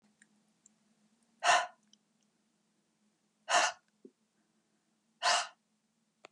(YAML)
exhalation_length: 6.3 s
exhalation_amplitude: 7036
exhalation_signal_mean_std_ratio: 0.26
survey_phase: alpha (2021-03-01 to 2021-08-12)
age: 65+
gender: Female
wearing_mask: 'No'
symptom_cough_any: true
symptom_onset: 5 days
smoker_status: Never smoked
respiratory_condition_asthma: false
respiratory_condition_other: false
recruitment_source: REACT
submission_delay: 1 day
covid_test_result: Negative
covid_test_method: RT-qPCR